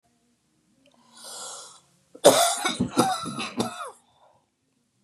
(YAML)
cough_length: 5.0 s
cough_amplitude: 27857
cough_signal_mean_std_ratio: 0.36
survey_phase: beta (2021-08-13 to 2022-03-07)
age: 45-64
gender: Female
wearing_mask: 'No'
symptom_cough_any: true
symptom_runny_or_blocked_nose: true
symptom_sore_throat: true
symptom_fatigue: true
symptom_headache: true
symptom_onset: 11 days
smoker_status: Never smoked
respiratory_condition_asthma: false
respiratory_condition_other: false
recruitment_source: REACT
submission_delay: 2 days
covid_test_result: Negative
covid_test_method: RT-qPCR
influenza_a_test_result: Negative
influenza_b_test_result: Negative